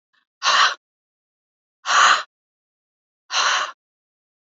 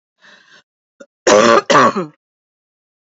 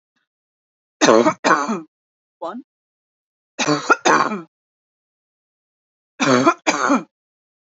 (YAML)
exhalation_length: 4.4 s
exhalation_amplitude: 24783
exhalation_signal_mean_std_ratio: 0.38
cough_length: 3.2 s
cough_amplitude: 29497
cough_signal_mean_std_ratio: 0.38
three_cough_length: 7.7 s
three_cough_amplitude: 32767
three_cough_signal_mean_std_ratio: 0.38
survey_phase: beta (2021-08-13 to 2022-03-07)
age: 45-64
gender: Female
wearing_mask: 'No'
symptom_runny_or_blocked_nose: true
symptom_shortness_of_breath: true
symptom_fatigue: true
smoker_status: Never smoked
respiratory_condition_asthma: false
respiratory_condition_other: false
recruitment_source: REACT
submission_delay: 2 days
covid_test_result: Negative
covid_test_method: RT-qPCR